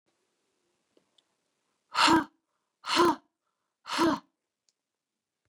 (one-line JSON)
{"exhalation_length": "5.5 s", "exhalation_amplitude": 10998, "exhalation_signal_mean_std_ratio": 0.29, "survey_phase": "beta (2021-08-13 to 2022-03-07)", "age": "45-64", "gender": "Female", "wearing_mask": "No", "symptom_none": true, "smoker_status": "Never smoked", "respiratory_condition_asthma": false, "respiratory_condition_other": false, "recruitment_source": "REACT", "submission_delay": "3 days", "covid_test_result": "Negative", "covid_test_method": "RT-qPCR", "influenza_a_test_result": "Negative", "influenza_b_test_result": "Negative"}